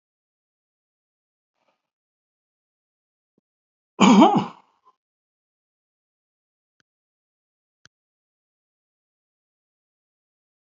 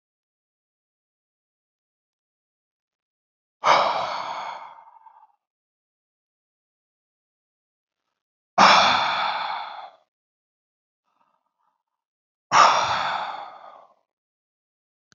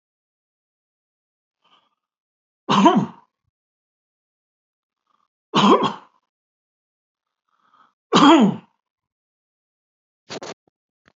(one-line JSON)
{"cough_length": "10.8 s", "cough_amplitude": 26342, "cough_signal_mean_std_ratio": 0.16, "exhalation_length": "15.2 s", "exhalation_amplitude": 26635, "exhalation_signal_mean_std_ratio": 0.3, "three_cough_length": "11.2 s", "three_cough_amplitude": 32768, "three_cough_signal_mean_std_ratio": 0.26, "survey_phase": "alpha (2021-03-01 to 2021-08-12)", "age": "65+", "gender": "Male", "wearing_mask": "No", "symptom_none": true, "smoker_status": "Never smoked", "respiratory_condition_asthma": false, "respiratory_condition_other": false, "recruitment_source": "REACT", "submission_delay": "3 days", "covid_test_result": "Negative", "covid_test_method": "RT-qPCR"}